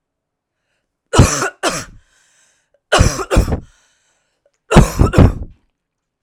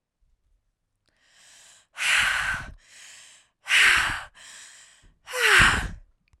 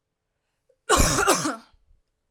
three_cough_length: 6.2 s
three_cough_amplitude: 32768
three_cough_signal_mean_std_ratio: 0.37
exhalation_length: 6.4 s
exhalation_amplitude: 23992
exhalation_signal_mean_std_ratio: 0.42
cough_length: 2.3 s
cough_amplitude: 18896
cough_signal_mean_std_ratio: 0.42
survey_phase: alpha (2021-03-01 to 2021-08-12)
age: 18-44
gender: Female
wearing_mask: 'No'
symptom_none: true
smoker_status: Never smoked
respiratory_condition_asthma: false
respiratory_condition_other: false
recruitment_source: Test and Trace
submission_delay: 1 day
covid_test_result: Positive
covid_test_method: RT-qPCR
covid_ct_value: 27.5
covid_ct_gene: N gene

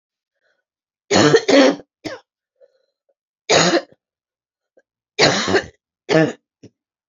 three_cough_length: 7.1 s
three_cough_amplitude: 32768
three_cough_signal_mean_std_ratio: 0.37
survey_phase: beta (2021-08-13 to 2022-03-07)
age: 45-64
gender: Female
wearing_mask: 'No'
symptom_cough_any: true
symptom_new_continuous_cough: true
symptom_runny_or_blocked_nose: true
symptom_shortness_of_breath: true
symptom_sore_throat: true
symptom_fatigue: true
symptom_change_to_sense_of_smell_or_taste: true
symptom_loss_of_taste: true
symptom_onset: 4 days
smoker_status: Never smoked
respiratory_condition_asthma: false
respiratory_condition_other: false
recruitment_source: Test and Trace
submission_delay: 2 days
covid_test_result: Positive
covid_test_method: RT-qPCR
covid_ct_value: 23.2
covid_ct_gene: ORF1ab gene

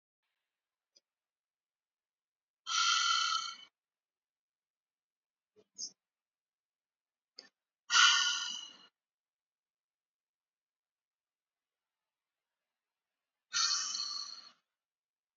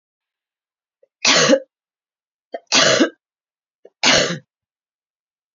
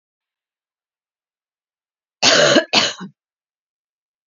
exhalation_length: 15.4 s
exhalation_amplitude: 8726
exhalation_signal_mean_std_ratio: 0.28
three_cough_length: 5.5 s
three_cough_amplitude: 31758
three_cough_signal_mean_std_ratio: 0.35
cough_length: 4.3 s
cough_amplitude: 32768
cough_signal_mean_std_ratio: 0.3
survey_phase: alpha (2021-03-01 to 2021-08-12)
age: 18-44
gender: Female
wearing_mask: 'No'
symptom_new_continuous_cough: true
symptom_fatigue: true
symptom_headache: true
symptom_onset: 4 days
smoker_status: Never smoked
respiratory_condition_asthma: false
respiratory_condition_other: false
recruitment_source: Test and Trace
submission_delay: 2 days
covid_test_result: Positive
covid_test_method: RT-qPCR
covid_ct_value: 16.5
covid_ct_gene: ORF1ab gene
covid_ct_mean: 17.2
covid_viral_load: 2300000 copies/ml
covid_viral_load_category: High viral load (>1M copies/ml)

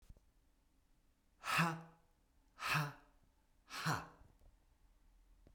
exhalation_length: 5.5 s
exhalation_amplitude: 3020
exhalation_signal_mean_std_ratio: 0.36
survey_phase: beta (2021-08-13 to 2022-03-07)
age: 45-64
gender: Male
wearing_mask: 'No'
symptom_none: true
smoker_status: Ex-smoker
respiratory_condition_asthma: false
respiratory_condition_other: false
recruitment_source: REACT
submission_delay: 0 days
covid_test_result: Negative
covid_test_method: RT-qPCR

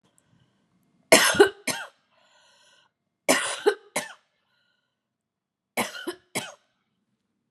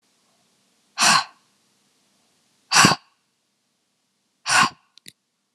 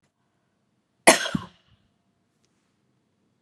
three_cough_length: 7.5 s
three_cough_amplitude: 30080
three_cough_signal_mean_std_ratio: 0.27
exhalation_length: 5.5 s
exhalation_amplitude: 31946
exhalation_signal_mean_std_ratio: 0.28
cough_length: 3.4 s
cough_amplitude: 32767
cough_signal_mean_std_ratio: 0.17
survey_phase: alpha (2021-03-01 to 2021-08-12)
age: 45-64
gender: Female
wearing_mask: 'No'
symptom_cough_any: true
symptom_new_continuous_cough: true
symptom_abdominal_pain: true
symptom_fatigue: true
smoker_status: Ex-smoker
respiratory_condition_asthma: false
respiratory_condition_other: false
recruitment_source: Test and Trace
submission_delay: 1 day
covid_test_result: Positive
covid_test_method: RT-qPCR
covid_ct_value: 17.3
covid_ct_gene: ORF1ab gene
covid_ct_mean: 18.1
covid_viral_load: 1100000 copies/ml
covid_viral_load_category: High viral load (>1M copies/ml)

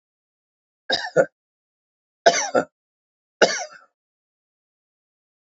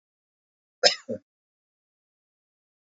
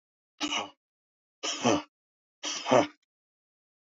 three_cough_length: 5.5 s
three_cough_amplitude: 28483
three_cough_signal_mean_std_ratio: 0.25
cough_length: 2.9 s
cough_amplitude: 23893
cough_signal_mean_std_ratio: 0.16
exhalation_length: 3.8 s
exhalation_amplitude: 13292
exhalation_signal_mean_std_ratio: 0.34
survey_phase: beta (2021-08-13 to 2022-03-07)
age: 65+
gender: Male
wearing_mask: 'No'
symptom_none: true
smoker_status: Never smoked
respiratory_condition_asthma: false
respiratory_condition_other: false
recruitment_source: REACT
submission_delay: 3 days
covid_test_result: Negative
covid_test_method: RT-qPCR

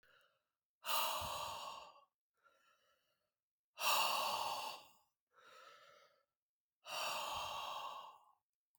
exhalation_length: 8.8 s
exhalation_amplitude: 2658
exhalation_signal_mean_std_ratio: 0.48
survey_phase: beta (2021-08-13 to 2022-03-07)
age: 45-64
gender: Male
wearing_mask: 'No'
symptom_none: true
smoker_status: Never smoked
respiratory_condition_asthma: false
respiratory_condition_other: false
recruitment_source: REACT
submission_delay: 2 days
covid_test_result: Negative
covid_test_method: RT-qPCR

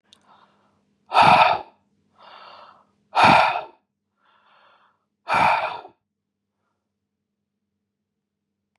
exhalation_length: 8.8 s
exhalation_amplitude: 28754
exhalation_signal_mean_std_ratio: 0.31
survey_phase: beta (2021-08-13 to 2022-03-07)
age: 18-44
gender: Male
wearing_mask: 'No'
symptom_none: true
symptom_onset: 8 days
smoker_status: Never smoked
respiratory_condition_asthma: false
respiratory_condition_other: false
recruitment_source: REACT
submission_delay: 0 days
covid_test_result: Negative
covid_test_method: RT-qPCR
covid_ct_value: 38.0
covid_ct_gene: N gene
influenza_a_test_result: Negative
influenza_b_test_result: Negative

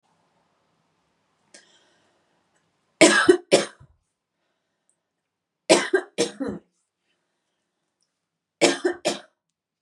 three_cough_length: 9.8 s
three_cough_amplitude: 30503
three_cough_signal_mean_std_ratio: 0.26
survey_phase: beta (2021-08-13 to 2022-03-07)
age: 18-44
gender: Female
wearing_mask: 'No'
symptom_headache: true
smoker_status: Never smoked
respiratory_condition_asthma: false
respiratory_condition_other: false
recruitment_source: REACT
submission_delay: 3 days
covid_test_result: Negative
covid_test_method: RT-qPCR
influenza_a_test_result: Negative
influenza_b_test_result: Negative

